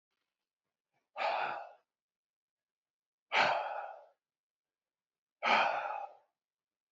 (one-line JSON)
{"exhalation_length": "6.9 s", "exhalation_amplitude": 6652, "exhalation_signal_mean_std_ratio": 0.37, "survey_phase": "beta (2021-08-13 to 2022-03-07)", "age": "45-64", "gender": "Male", "wearing_mask": "No", "symptom_none": true, "smoker_status": "Never smoked", "respiratory_condition_asthma": false, "respiratory_condition_other": false, "recruitment_source": "REACT", "submission_delay": "1 day", "covid_test_result": "Negative", "covid_test_method": "RT-qPCR"}